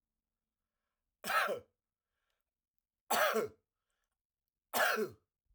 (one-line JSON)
{"cough_length": "5.5 s", "cough_amplitude": 4145, "cough_signal_mean_std_ratio": 0.35, "survey_phase": "alpha (2021-03-01 to 2021-08-12)", "age": "45-64", "gender": "Male", "wearing_mask": "No", "symptom_none": true, "symptom_onset": "6 days", "smoker_status": "Never smoked", "respiratory_condition_asthma": true, "respiratory_condition_other": false, "recruitment_source": "REACT", "submission_delay": "3 days", "covid_test_result": "Negative", "covid_test_method": "RT-qPCR"}